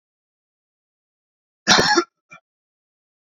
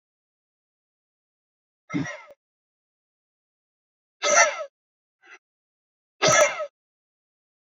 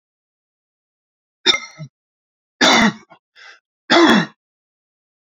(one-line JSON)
{"cough_length": "3.2 s", "cough_amplitude": 29950, "cough_signal_mean_std_ratio": 0.26, "exhalation_length": "7.7 s", "exhalation_amplitude": 22791, "exhalation_signal_mean_std_ratio": 0.26, "three_cough_length": "5.4 s", "three_cough_amplitude": 31039, "three_cough_signal_mean_std_ratio": 0.32, "survey_phase": "beta (2021-08-13 to 2022-03-07)", "age": "45-64", "gender": "Male", "wearing_mask": "No", "symptom_runny_or_blocked_nose": true, "symptom_shortness_of_breath": true, "symptom_sore_throat": true, "symptom_fatigue": true, "symptom_headache": true, "symptom_onset": "12 days", "smoker_status": "Ex-smoker", "respiratory_condition_asthma": true, "respiratory_condition_other": false, "recruitment_source": "REACT", "submission_delay": "0 days", "covid_test_result": "Negative", "covid_test_method": "RT-qPCR"}